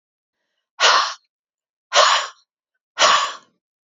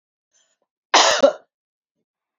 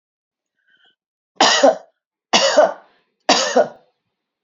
{"exhalation_length": "3.8 s", "exhalation_amplitude": 27970, "exhalation_signal_mean_std_ratio": 0.4, "cough_length": "2.4 s", "cough_amplitude": 29647, "cough_signal_mean_std_ratio": 0.3, "three_cough_length": "4.4 s", "three_cough_amplitude": 31744, "three_cough_signal_mean_std_ratio": 0.39, "survey_phase": "beta (2021-08-13 to 2022-03-07)", "age": "65+", "gender": "Female", "wearing_mask": "No", "symptom_none": true, "smoker_status": "Ex-smoker", "respiratory_condition_asthma": false, "respiratory_condition_other": false, "recruitment_source": "REACT", "submission_delay": "2 days", "covid_test_result": "Negative", "covid_test_method": "RT-qPCR"}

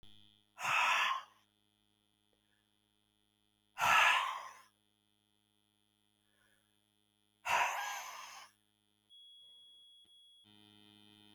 {"exhalation_length": "11.3 s", "exhalation_amplitude": 4632, "exhalation_signal_mean_std_ratio": 0.33, "survey_phase": "beta (2021-08-13 to 2022-03-07)", "age": "65+", "gender": "Female", "wearing_mask": "No", "symptom_none": true, "smoker_status": "Never smoked", "respiratory_condition_asthma": false, "respiratory_condition_other": false, "recruitment_source": "REACT", "submission_delay": "2 days", "covid_test_result": "Negative", "covid_test_method": "RT-qPCR", "influenza_a_test_result": "Unknown/Void", "influenza_b_test_result": "Unknown/Void"}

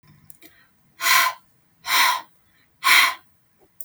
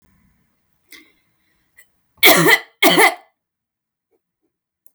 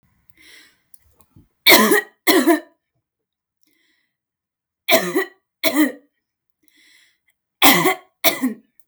{"exhalation_length": "3.8 s", "exhalation_amplitude": 28292, "exhalation_signal_mean_std_ratio": 0.41, "cough_length": "4.9 s", "cough_amplitude": 32768, "cough_signal_mean_std_ratio": 0.3, "three_cough_length": "8.9 s", "three_cough_amplitude": 32768, "three_cough_signal_mean_std_ratio": 0.35, "survey_phase": "beta (2021-08-13 to 2022-03-07)", "age": "18-44", "gender": "Female", "wearing_mask": "No", "symptom_runny_or_blocked_nose": true, "smoker_status": "Ex-smoker", "respiratory_condition_asthma": false, "respiratory_condition_other": false, "recruitment_source": "REACT", "submission_delay": "2 days", "covid_test_result": "Negative", "covid_test_method": "RT-qPCR"}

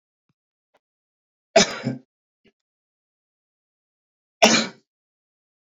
{"cough_length": "5.7 s", "cough_amplitude": 29231, "cough_signal_mean_std_ratio": 0.21, "survey_phase": "beta (2021-08-13 to 2022-03-07)", "age": "45-64", "gender": "Male", "wearing_mask": "No", "symptom_none": true, "smoker_status": "Current smoker (11 or more cigarettes per day)", "respiratory_condition_asthma": false, "respiratory_condition_other": false, "recruitment_source": "REACT", "submission_delay": "1 day", "covid_test_result": "Negative", "covid_test_method": "RT-qPCR"}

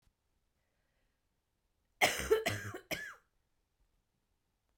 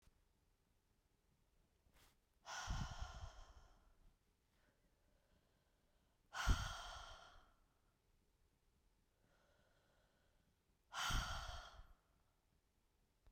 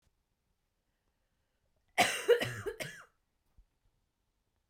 {"three_cough_length": "4.8 s", "three_cough_amplitude": 6474, "three_cough_signal_mean_std_ratio": 0.28, "exhalation_length": "13.3 s", "exhalation_amplitude": 1950, "exhalation_signal_mean_std_ratio": 0.32, "cough_length": "4.7 s", "cough_amplitude": 7537, "cough_signal_mean_std_ratio": 0.26, "survey_phase": "beta (2021-08-13 to 2022-03-07)", "age": "45-64", "gender": "Female", "wearing_mask": "No", "symptom_cough_any": true, "symptom_new_continuous_cough": true, "symptom_runny_or_blocked_nose": true, "symptom_sore_throat": true, "symptom_headache": true, "symptom_onset": "4 days", "smoker_status": "Never smoked", "respiratory_condition_asthma": false, "respiratory_condition_other": false, "recruitment_source": "Test and Trace", "submission_delay": "2 days", "covid_test_result": "Positive", "covid_test_method": "RT-qPCR"}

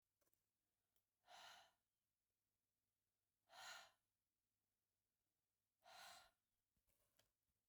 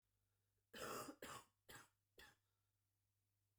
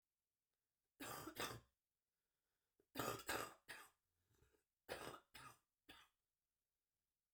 {"exhalation_length": "7.7 s", "exhalation_amplitude": 147, "exhalation_signal_mean_std_ratio": 0.34, "cough_length": "3.6 s", "cough_amplitude": 383, "cough_signal_mean_std_ratio": 0.4, "three_cough_length": "7.3 s", "three_cough_amplitude": 999, "three_cough_signal_mean_std_ratio": 0.35, "survey_phase": "beta (2021-08-13 to 2022-03-07)", "age": "45-64", "gender": "Female", "wearing_mask": "No", "symptom_cough_any": true, "symptom_runny_or_blocked_nose": true, "symptom_abdominal_pain": true, "symptom_diarrhoea": true, "symptom_fatigue": true, "symptom_fever_high_temperature": true, "symptom_headache": true, "smoker_status": "Current smoker (e-cigarettes or vapes only)", "respiratory_condition_asthma": false, "respiratory_condition_other": false, "recruitment_source": "Test and Trace", "submission_delay": "1 day", "covid_test_result": "Positive", "covid_test_method": "ePCR"}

